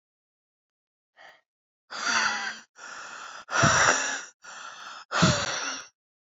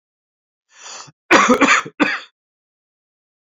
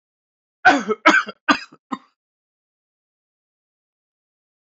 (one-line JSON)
{"exhalation_length": "6.2 s", "exhalation_amplitude": 15964, "exhalation_signal_mean_std_ratio": 0.47, "cough_length": "3.4 s", "cough_amplitude": 30869, "cough_signal_mean_std_ratio": 0.36, "three_cough_length": "4.6 s", "three_cough_amplitude": 27998, "three_cough_signal_mean_std_ratio": 0.25, "survey_phase": "alpha (2021-03-01 to 2021-08-12)", "age": "45-64", "gender": "Male", "wearing_mask": "No", "symptom_none": true, "smoker_status": "Never smoked", "respiratory_condition_asthma": false, "respiratory_condition_other": false, "recruitment_source": "REACT", "submission_delay": "3 days", "covid_test_result": "Negative", "covid_test_method": "RT-qPCR"}